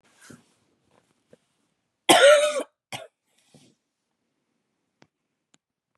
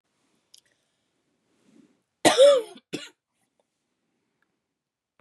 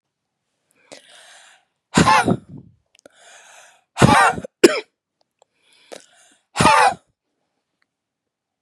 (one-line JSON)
{"cough_length": "6.0 s", "cough_amplitude": 32368, "cough_signal_mean_std_ratio": 0.23, "three_cough_length": "5.2 s", "three_cough_amplitude": 22200, "three_cough_signal_mean_std_ratio": 0.22, "exhalation_length": "8.6 s", "exhalation_amplitude": 32768, "exhalation_signal_mean_std_ratio": 0.3, "survey_phase": "beta (2021-08-13 to 2022-03-07)", "age": "18-44", "gender": "Female", "wearing_mask": "No", "symptom_cough_any": true, "symptom_runny_or_blocked_nose": true, "symptom_fever_high_temperature": true, "symptom_other": true, "symptom_onset": "3 days", "smoker_status": "Never smoked", "respiratory_condition_asthma": true, "respiratory_condition_other": false, "recruitment_source": "Test and Trace", "submission_delay": "1 day", "covid_test_result": "Positive", "covid_test_method": "RT-qPCR", "covid_ct_value": 23.0, "covid_ct_gene": "ORF1ab gene", "covid_ct_mean": 23.4, "covid_viral_load": "22000 copies/ml", "covid_viral_load_category": "Low viral load (10K-1M copies/ml)"}